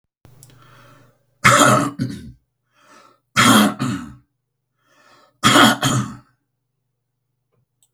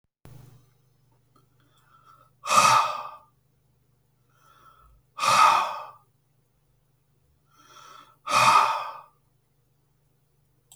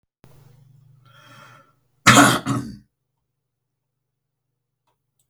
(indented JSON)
{
  "three_cough_length": "7.9 s",
  "three_cough_amplitude": 32768,
  "three_cough_signal_mean_std_ratio": 0.37,
  "exhalation_length": "10.8 s",
  "exhalation_amplitude": 19210,
  "exhalation_signal_mean_std_ratio": 0.32,
  "cough_length": "5.3 s",
  "cough_amplitude": 32768,
  "cough_signal_mean_std_ratio": 0.23,
  "survey_phase": "beta (2021-08-13 to 2022-03-07)",
  "age": "65+",
  "gender": "Male",
  "wearing_mask": "No",
  "symptom_none": true,
  "smoker_status": "Current smoker (11 or more cigarettes per day)",
  "respiratory_condition_asthma": false,
  "respiratory_condition_other": false,
  "recruitment_source": "REACT",
  "submission_delay": "0 days",
  "covid_test_result": "Negative",
  "covid_test_method": "RT-qPCR"
}